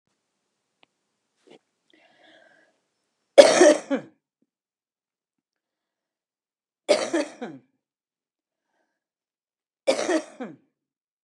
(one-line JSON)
{"three_cough_length": "11.2 s", "three_cough_amplitude": 32768, "three_cough_signal_mean_std_ratio": 0.21, "survey_phase": "beta (2021-08-13 to 2022-03-07)", "age": "65+", "gender": "Female", "wearing_mask": "No", "symptom_cough_any": true, "symptom_shortness_of_breath": true, "symptom_onset": "12 days", "smoker_status": "Never smoked", "respiratory_condition_asthma": true, "respiratory_condition_other": false, "recruitment_source": "REACT", "submission_delay": "4 days", "covid_test_result": "Negative", "covid_test_method": "RT-qPCR", "influenza_a_test_result": "Negative", "influenza_b_test_result": "Negative"}